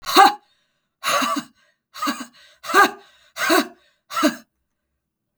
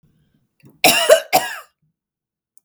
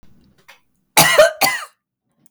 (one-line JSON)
{"exhalation_length": "5.4 s", "exhalation_amplitude": 32768, "exhalation_signal_mean_std_ratio": 0.38, "three_cough_length": "2.6 s", "three_cough_amplitude": 32768, "three_cough_signal_mean_std_ratio": 0.33, "cough_length": "2.3 s", "cough_amplitude": 32768, "cough_signal_mean_std_ratio": 0.38, "survey_phase": "beta (2021-08-13 to 2022-03-07)", "age": "45-64", "gender": "Female", "wearing_mask": "No", "symptom_diarrhoea": true, "smoker_status": "Never smoked", "respiratory_condition_asthma": false, "respiratory_condition_other": false, "recruitment_source": "REACT", "submission_delay": "9 days", "covid_test_result": "Negative", "covid_test_method": "RT-qPCR"}